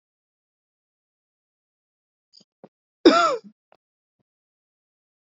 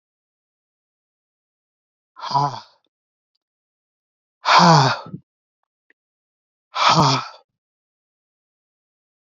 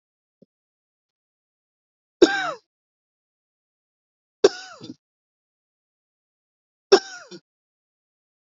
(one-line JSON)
{"cough_length": "5.3 s", "cough_amplitude": 27122, "cough_signal_mean_std_ratio": 0.18, "exhalation_length": "9.3 s", "exhalation_amplitude": 29066, "exhalation_signal_mean_std_ratio": 0.28, "three_cough_length": "8.4 s", "three_cough_amplitude": 29332, "three_cough_signal_mean_std_ratio": 0.15, "survey_phase": "beta (2021-08-13 to 2022-03-07)", "age": "18-44", "gender": "Male", "wearing_mask": "No", "symptom_none": true, "smoker_status": "Never smoked", "respiratory_condition_asthma": false, "respiratory_condition_other": false, "recruitment_source": "REACT", "submission_delay": "0 days", "covid_test_result": "Negative", "covid_test_method": "RT-qPCR", "influenza_a_test_result": "Negative", "influenza_b_test_result": "Negative"}